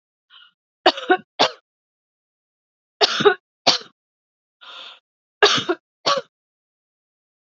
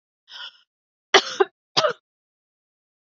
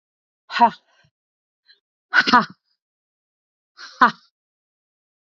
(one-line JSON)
{"three_cough_length": "7.4 s", "three_cough_amplitude": 30332, "three_cough_signal_mean_std_ratio": 0.28, "cough_length": "3.2 s", "cough_amplitude": 28963, "cough_signal_mean_std_ratio": 0.23, "exhalation_length": "5.4 s", "exhalation_amplitude": 27727, "exhalation_signal_mean_std_ratio": 0.23, "survey_phase": "beta (2021-08-13 to 2022-03-07)", "age": "45-64", "gender": "Female", "wearing_mask": "No", "symptom_shortness_of_breath": true, "symptom_diarrhoea": true, "symptom_onset": "3 days", "smoker_status": "Ex-smoker", "respiratory_condition_asthma": true, "respiratory_condition_other": false, "recruitment_source": "Test and Trace", "submission_delay": "1 day", "covid_test_result": "Positive", "covid_test_method": "RT-qPCR", "covid_ct_value": 27.8, "covid_ct_gene": "ORF1ab gene"}